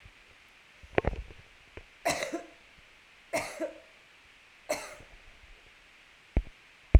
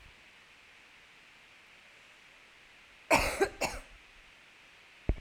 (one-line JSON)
{"three_cough_length": "7.0 s", "three_cough_amplitude": 18852, "three_cough_signal_mean_std_ratio": 0.24, "cough_length": "5.2 s", "cough_amplitude": 10446, "cough_signal_mean_std_ratio": 0.31, "survey_phase": "alpha (2021-03-01 to 2021-08-12)", "age": "45-64", "gender": "Female", "wearing_mask": "No", "symptom_new_continuous_cough": true, "symptom_fatigue": true, "symptom_headache": true, "symptom_onset": "5 days", "smoker_status": "Never smoked", "respiratory_condition_asthma": false, "respiratory_condition_other": false, "recruitment_source": "Test and Trace", "submission_delay": "1 day", "covid_test_result": "Positive", "covid_test_method": "RT-qPCR", "covid_ct_value": 15.6, "covid_ct_gene": "ORF1ab gene", "covid_ct_mean": 16.0, "covid_viral_load": "5500000 copies/ml", "covid_viral_load_category": "High viral load (>1M copies/ml)"}